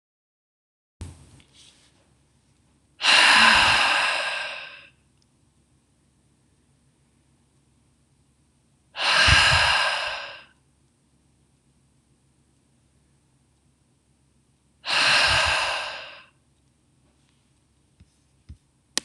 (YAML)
exhalation_length: 19.0 s
exhalation_amplitude: 25778
exhalation_signal_mean_std_ratio: 0.36
survey_phase: beta (2021-08-13 to 2022-03-07)
age: 45-64
gender: Male
wearing_mask: 'No'
symptom_runny_or_blocked_nose: true
symptom_onset: 13 days
smoker_status: Never smoked
respiratory_condition_asthma: false
respiratory_condition_other: false
recruitment_source: REACT
submission_delay: 1 day
covid_test_result: Negative
covid_test_method: RT-qPCR
influenza_a_test_result: Unknown/Void
influenza_b_test_result: Unknown/Void